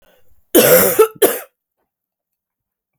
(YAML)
cough_length: 3.0 s
cough_amplitude: 32768
cough_signal_mean_std_ratio: 0.38
survey_phase: beta (2021-08-13 to 2022-03-07)
age: 18-44
gender: Female
wearing_mask: 'No'
symptom_cough_any: true
symptom_runny_or_blocked_nose: true
symptom_headache: true
smoker_status: Ex-smoker
respiratory_condition_asthma: false
respiratory_condition_other: false
recruitment_source: Test and Trace
submission_delay: 2 days
covid_test_result: Positive
covid_test_method: LFT